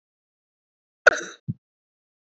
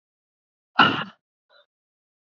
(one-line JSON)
{"cough_length": "2.4 s", "cough_amplitude": 26990, "cough_signal_mean_std_ratio": 0.14, "exhalation_length": "2.4 s", "exhalation_amplitude": 27361, "exhalation_signal_mean_std_ratio": 0.22, "survey_phase": "beta (2021-08-13 to 2022-03-07)", "age": "18-44", "gender": "Female", "wearing_mask": "No", "symptom_new_continuous_cough": true, "symptom_runny_or_blocked_nose": true, "symptom_fatigue": true, "symptom_headache": true, "symptom_change_to_sense_of_smell_or_taste": true, "symptom_loss_of_taste": true, "symptom_other": true, "symptom_onset": "4 days", "smoker_status": "Never smoked", "respiratory_condition_asthma": false, "respiratory_condition_other": false, "recruitment_source": "Test and Trace", "submission_delay": "1 day", "covid_test_result": "Positive", "covid_test_method": "RT-qPCR", "covid_ct_value": 22.8, "covid_ct_gene": "ORF1ab gene"}